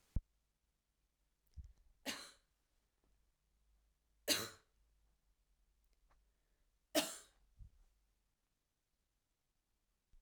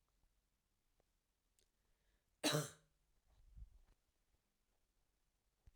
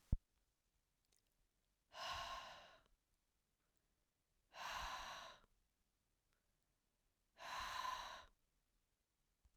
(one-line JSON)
{"three_cough_length": "10.2 s", "three_cough_amplitude": 3582, "three_cough_signal_mean_std_ratio": 0.2, "cough_length": "5.8 s", "cough_amplitude": 1785, "cough_signal_mean_std_ratio": 0.19, "exhalation_length": "9.6 s", "exhalation_amplitude": 1984, "exhalation_signal_mean_std_ratio": 0.36, "survey_phase": "beta (2021-08-13 to 2022-03-07)", "age": "18-44", "gender": "Female", "wearing_mask": "No", "symptom_cough_any": true, "symptom_runny_or_blocked_nose": true, "symptom_sore_throat": true, "symptom_abdominal_pain": true, "symptom_diarrhoea": true, "symptom_fatigue": true, "symptom_onset": "3 days", "smoker_status": "Ex-smoker", "respiratory_condition_asthma": false, "respiratory_condition_other": false, "recruitment_source": "Test and Trace", "submission_delay": "2 days", "covid_test_result": "Positive", "covid_test_method": "RT-qPCR", "covid_ct_value": 25.0, "covid_ct_gene": "ORF1ab gene", "covid_ct_mean": 25.3, "covid_viral_load": "5200 copies/ml", "covid_viral_load_category": "Minimal viral load (< 10K copies/ml)"}